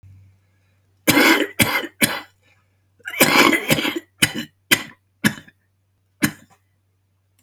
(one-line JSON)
{"cough_length": "7.4 s", "cough_amplitude": 32768, "cough_signal_mean_std_ratio": 0.39, "survey_phase": "beta (2021-08-13 to 2022-03-07)", "age": "65+", "gender": "Male", "wearing_mask": "No", "symptom_cough_any": true, "smoker_status": "Ex-smoker", "respiratory_condition_asthma": false, "respiratory_condition_other": true, "recruitment_source": "REACT", "submission_delay": "1 day", "covid_test_result": "Negative", "covid_test_method": "RT-qPCR", "influenza_a_test_result": "Negative", "influenza_b_test_result": "Negative"}